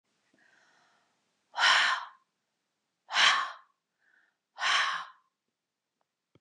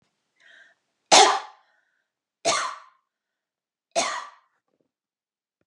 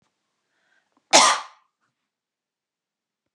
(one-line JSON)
{"exhalation_length": "6.4 s", "exhalation_amplitude": 10906, "exhalation_signal_mean_std_ratio": 0.35, "three_cough_length": "5.7 s", "three_cough_amplitude": 27780, "three_cough_signal_mean_std_ratio": 0.25, "cough_length": "3.3 s", "cough_amplitude": 31983, "cough_signal_mean_std_ratio": 0.21, "survey_phase": "beta (2021-08-13 to 2022-03-07)", "age": "45-64", "gender": "Female", "wearing_mask": "No", "symptom_none": true, "smoker_status": "Never smoked", "respiratory_condition_asthma": false, "respiratory_condition_other": false, "recruitment_source": "REACT", "submission_delay": "3 days", "covid_test_result": "Negative", "covid_test_method": "RT-qPCR", "influenza_a_test_result": "Negative", "influenza_b_test_result": "Negative"}